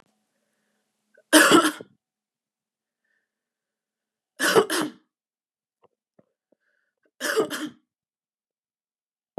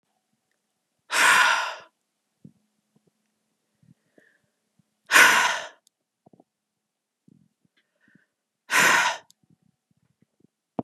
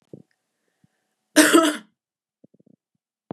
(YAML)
three_cough_length: 9.4 s
three_cough_amplitude: 25940
three_cough_signal_mean_std_ratio: 0.25
exhalation_length: 10.8 s
exhalation_amplitude: 25930
exhalation_signal_mean_std_ratio: 0.29
cough_length: 3.3 s
cough_amplitude: 30956
cough_signal_mean_std_ratio: 0.26
survey_phase: beta (2021-08-13 to 2022-03-07)
age: 18-44
gender: Female
wearing_mask: 'No'
symptom_none: true
smoker_status: Never smoked
respiratory_condition_asthma: false
respiratory_condition_other: false
recruitment_source: REACT
submission_delay: 1 day
covid_test_result: Negative
covid_test_method: RT-qPCR
influenza_a_test_result: Negative
influenza_b_test_result: Negative